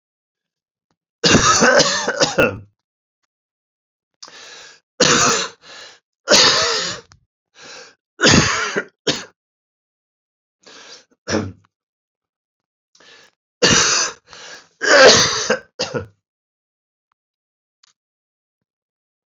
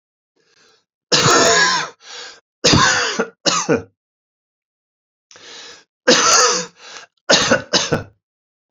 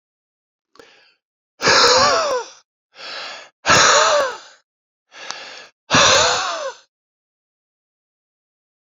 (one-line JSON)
{"three_cough_length": "19.3 s", "three_cough_amplitude": 32767, "three_cough_signal_mean_std_ratio": 0.38, "cough_length": "8.7 s", "cough_amplitude": 32768, "cough_signal_mean_std_ratio": 0.48, "exhalation_length": "9.0 s", "exhalation_amplitude": 29119, "exhalation_signal_mean_std_ratio": 0.43, "survey_phase": "beta (2021-08-13 to 2022-03-07)", "age": "45-64", "gender": "Male", "wearing_mask": "No", "symptom_cough_any": true, "symptom_runny_or_blocked_nose": true, "symptom_fever_high_temperature": true, "symptom_headache": true, "smoker_status": "Ex-smoker", "respiratory_condition_asthma": false, "respiratory_condition_other": false, "recruitment_source": "Test and Trace", "submission_delay": "-1 day", "covid_test_result": "Positive", "covid_test_method": "LFT"}